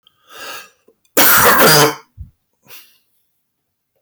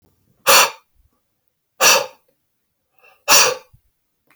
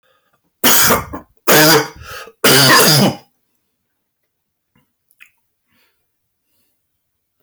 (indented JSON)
{
  "cough_length": "4.0 s",
  "cough_amplitude": 31406,
  "cough_signal_mean_std_ratio": 0.43,
  "exhalation_length": "4.4 s",
  "exhalation_amplitude": 25452,
  "exhalation_signal_mean_std_ratio": 0.34,
  "three_cough_length": "7.4 s",
  "three_cough_amplitude": 29976,
  "three_cough_signal_mean_std_ratio": 0.42,
  "survey_phase": "alpha (2021-03-01 to 2021-08-12)",
  "age": "45-64",
  "gender": "Male",
  "wearing_mask": "No",
  "symptom_fatigue": true,
  "symptom_fever_high_temperature": true,
  "symptom_headache": true,
  "symptom_onset": "4 days",
  "smoker_status": "Ex-smoker",
  "recruitment_source": "REACT",
  "submission_delay": "2 days",
  "covid_test_result": "Negative",
  "covid_test_method": "RT-qPCR"
}